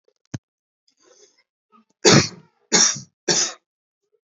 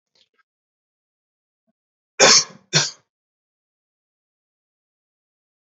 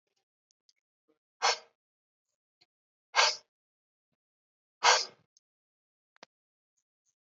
{"three_cough_length": "4.3 s", "three_cough_amplitude": 30034, "three_cough_signal_mean_std_ratio": 0.31, "cough_length": "5.6 s", "cough_amplitude": 32768, "cough_signal_mean_std_ratio": 0.2, "exhalation_length": "7.3 s", "exhalation_amplitude": 12280, "exhalation_signal_mean_std_ratio": 0.2, "survey_phase": "beta (2021-08-13 to 2022-03-07)", "age": "18-44", "gender": "Male", "wearing_mask": "No", "symptom_none": true, "smoker_status": "Never smoked", "respiratory_condition_asthma": false, "respiratory_condition_other": false, "recruitment_source": "REACT", "submission_delay": "1 day", "covid_test_result": "Negative", "covid_test_method": "RT-qPCR", "influenza_a_test_result": "Negative", "influenza_b_test_result": "Negative"}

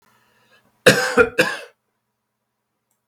{"cough_length": "3.1 s", "cough_amplitude": 32768, "cough_signal_mean_std_ratio": 0.3, "survey_phase": "beta (2021-08-13 to 2022-03-07)", "age": "65+", "gender": "Male", "wearing_mask": "No", "symptom_cough_any": true, "symptom_runny_or_blocked_nose": true, "symptom_sore_throat": true, "symptom_fatigue": true, "symptom_loss_of_taste": true, "symptom_onset": "6 days", "smoker_status": "Ex-smoker", "respiratory_condition_asthma": false, "respiratory_condition_other": false, "recruitment_source": "Test and Trace", "submission_delay": "1 day", "covid_test_result": "Positive", "covid_test_method": "RT-qPCR", "covid_ct_value": 15.8, "covid_ct_gene": "N gene", "covid_ct_mean": 16.2, "covid_viral_load": "4900000 copies/ml", "covid_viral_load_category": "High viral load (>1M copies/ml)"}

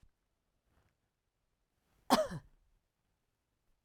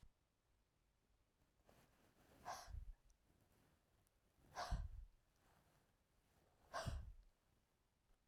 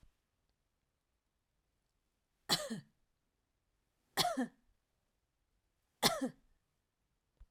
{"cough_length": "3.8 s", "cough_amplitude": 7595, "cough_signal_mean_std_ratio": 0.18, "exhalation_length": "8.3 s", "exhalation_amplitude": 633, "exhalation_signal_mean_std_ratio": 0.36, "three_cough_length": "7.5 s", "three_cough_amplitude": 5511, "three_cough_signal_mean_std_ratio": 0.24, "survey_phase": "alpha (2021-03-01 to 2021-08-12)", "age": "45-64", "gender": "Female", "wearing_mask": "No", "symptom_none": true, "smoker_status": "Never smoked", "respiratory_condition_asthma": false, "respiratory_condition_other": false, "recruitment_source": "REACT", "submission_delay": "1 day", "covid_test_result": "Negative", "covid_test_method": "RT-qPCR"}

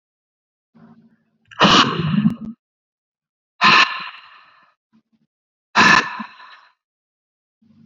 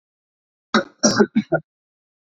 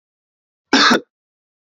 {"exhalation_length": "7.9 s", "exhalation_amplitude": 32768, "exhalation_signal_mean_std_ratio": 0.34, "three_cough_length": "2.4 s", "three_cough_amplitude": 26711, "three_cough_signal_mean_std_ratio": 0.33, "cough_length": "1.7 s", "cough_amplitude": 30344, "cough_signal_mean_std_ratio": 0.32, "survey_phase": "beta (2021-08-13 to 2022-03-07)", "age": "18-44", "gender": "Male", "wearing_mask": "No", "symptom_none": true, "smoker_status": "Never smoked", "respiratory_condition_asthma": false, "respiratory_condition_other": false, "recruitment_source": "Test and Trace", "submission_delay": "2 days", "covid_test_result": "Positive", "covid_test_method": "LFT"}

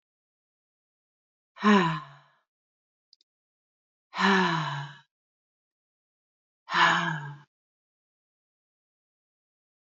{"exhalation_length": "9.8 s", "exhalation_amplitude": 14678, "exhalation_signal_mean_std_ratio": 0.3, "survey_phase": "beta (2021-08-13 to 2022-03-07)", "age": "45-64", "gender": "Female", "wearing_mask": "No", "symptom_none": true, "smoker_status": "Never smoked", "respiratory_condition_asthma": false, "respiratory_condition_other": false, "recruitment_source": "REACT", "submission_delay": "2 days", "covid_test_result": "Negative", "covid_test_method": "RT-qPCR", "influenza_a_test_result": "Negative", "influenza_b_test_result": "Negative"}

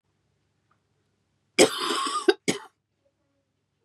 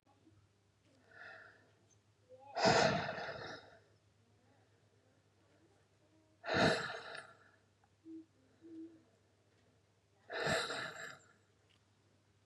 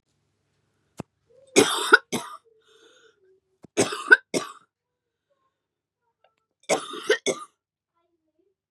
{"cough_length": "3.8 s", "cough_amplitude": 26223, "cough_signal_mean_std_ratio": 0.28, "exhalation_length": "12.5 s", "exhalation_amplitude": 4613, "exhalation_signal_mean_std_ratio": 0.34, "three_cough_length": "8.7 s", "three_cough_amplitude": 32341, "three_cough_signal_mean_std_ratio": 0.24, "survey_phase": "beta (2021-08-13 to 2022-03-07)", "age": "18-44", "gender": "Female", "wearing_mask": "No", "symptom_cough_any": true, "smoker_status": "Never smoked", "respiratory_condition_asthma": true, "respiratory_condition_other": false, "recruitment_source": "REACT", "submission_delay": "1 day", "covid_test_result": "Negative", "covid_test_method": "RT-qPCR", "influenza_a_test_result": "Negative", "influenza_b_test_result": "Negative"}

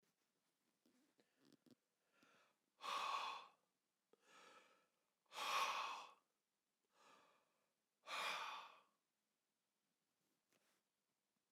{"exhalation_length": "11.5 s", "exhalation_amplitude": 922, "exhalation_signal_mean_std_ratio": 0.35, "survey_phase": "alpha (2021-03-01 to 2021-08-12)", "age": "65+", "gender": "Male", "wearing_mask": "No", "symptom_none": true, "smoker_status": "Never smoked", "respiratory_condition_asthma": false, "respiratory_condition_other": false, "recruitment_source": "REACT", "submission_delay": "3 days", "covid_test_result": "Negative", "covid_test_method": "RT-qPCR"}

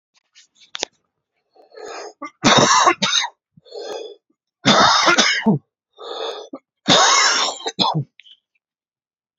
{"three_cough_length": "9.4 s", "three_cough_amplitude": 32767, "three_cough_signal_mean_std_ratio": 0.47, "survey_phase": "beta (2021-08-13 to 2022-03-07)", "age": "18-44", "gender": "Male", "wearing_mask": "No", "symptom_cough_any": true, "symptom_runny_or_blocked_nose": true, "symptom_fatigue": true, "symptom_headache": true, "symptom_onset": "3 days", "smoker_status": "Ex-smoker", "respiratory_condition_asthma": false, "respiratory_condition_other": false, "recruitment_source": "Test and Trace", "submission_delay": "1 day", "covid_test_result": "Positive", "covid_test_method": "RT-qPCR", "covid_ct_value": 17.1, "covid_ct_gene": "ORF1ab gene", "covid_ct_mean": 17.4, "covid_viral_load": "1900000 copies/ml", "covid_viral_load_category": "High viral load (>1M copies/ml)"}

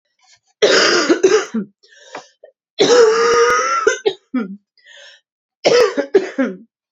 {"three_cough_length": "6.9 s", "three_cough_amplitude": 32767, "three_cough_signal_mean_std_ratio": 0.57, "survey_phase": "beta (2021-08-13 to 2022-03-07)", "age": "18-44", "gender": "Female", "wearing_mask": "No", "symptom_cough_any": true, "symptom_runny_or_blocked_nose": true, "symptom_sore_throat": true, "symptom_fatigue": true, "symptom_headache": true, "symptom_change_to_sense_of_smell_or_taste": true, "symptom_loss_of_taste": true, "symptom_onset": "4 days", "smoker_status": "Ex-smoker", "respiratory_condition_asthma": false, "respiratory_condition_other": false, "recruitment_source": "Test and Trace", "submission_delay": "2 days", "covid_test_result": "Positive", "covid_test_method": "RT-qPCR", "covid_ct_value": 14.7, "covid_ct_gene": "ORF1ab gene", "covid_ct_mean": 15.3, "covid_viral_load": "9800000 copies/ml", "covid_viral_load_category": "High viral load (>1M copies/ml)"}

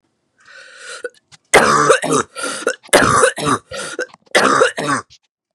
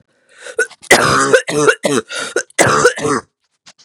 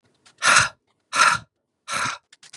{"three_cough_length": "5.5 s", "three_cough_amplitude": 32768, "three_cough_signal_mean_std_ratio": 0.53, "cough_length": "3.8 s", "cough_amplitude": 32768, "cough_signal_mean_std_ratio": 0.56, "exhalation_length": "2.6 s", "exhalation_amplitude": 30031, "exhalation_signal_mean_std_ratio": 0.41, "survey_phase": "beta (2021-08-13 to 2022-03-07)", "age": "18-44", "gender": "Female", "wearing_mask": "No", "symptom_cough_any": true, "symptom_new_continuous_cough": true, "symptom_runny_or_blocked_nose": true, "symptom_change_to_sense_of_smell_or_taste": true, "symptom_loss_of_taste": true, "symptom_onset": "7 days", "smoker_status": "Never smoked", "respiratory_condition_asthma": false, "respiratory_condition_other": false, "recruitment_source": "Test and Trace", "submission_delay": "2 days", "covid_test_result": "Negative", "covid_test_method": "RT-qPCR"}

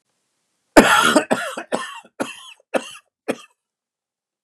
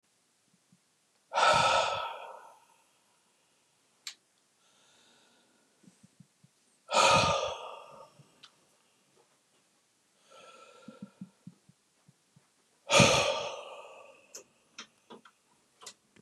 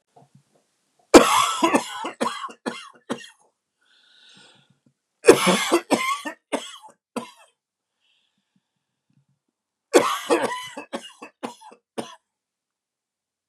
{"cough_length": "4.4 s", "cough_amplitude": 32768, "cough_signal_mean_std_ratio": 0.33, "exhalation_length": "16.2 s", "exhalation_amplitude": 14550, "exhalation_signal_mean_std_ratio": 0.3, "three_cough_length": "13.5 s", "three_cough_amplitude": 32768, "three_cough_signal_mean_std_ratio": 0.3, "survey_phase": "beta (2021-08-13 to 2022-03-07)", "age": "45-64", "gender": "Male", "wearing_mask": "No", "symptom_none": true, "smoker_status": "Never smoked", "respiratory_condition_asthma": false, "respiratory_condition_other": false, "recruitment_source": "Test and Trace", "submission_delay": "1 day", "covid_test_result": "Negative", "covid_test_method": "RT-qPCR"}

